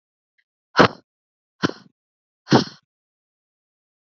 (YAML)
exhalation_length: 4.1 s
exhalation_amplitude: 27879
exhalation_signal_mean_std_ratio: 0.2
survey_phase: beta (2021-08-13 to 2022-03-07)
age: 45-64
gender: Female
wearing_mask: 'No'
symptom_cough_any: true
smoker_status: Never smoked
respiratory_condition_asthma: false
respiratory_condition_other: false
recruitment_source: Test and Trace
submission_delay: 1 day
covid_test_result: Negative
covid_test_method: LFT